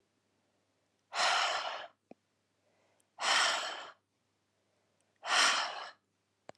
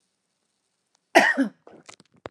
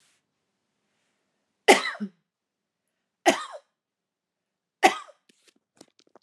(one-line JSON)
{"exhalation_length": "6.6 s", "exhalation_amplitude": 5936, "exhalation_signal_mean_std_ratio": 0.42, "cough_length": "2.3 s", "cough_amplitude": 27669, "cough_signal_mean_std_ratio": 0.28, "three_cough_length": "6.2 s", "three_cough_amplitude": 27855, "three_cough_signal_mean_std_ratio": 0.19, "survey_phase": "beta (2021-08-13 to 2022-03-07)", "age": "18-44", "gender": "Female", "wearing_mask": "No", "symptom_none": true, "smoker_status": "Never smoked", "respiratory_condition_asthma": false, "respiratory_condition_other": false, "recruitment_source": "REACT", "submission_delay": "1 day", "covid_test_result": "Negative", "covid_test_method": "RT-qPCR"}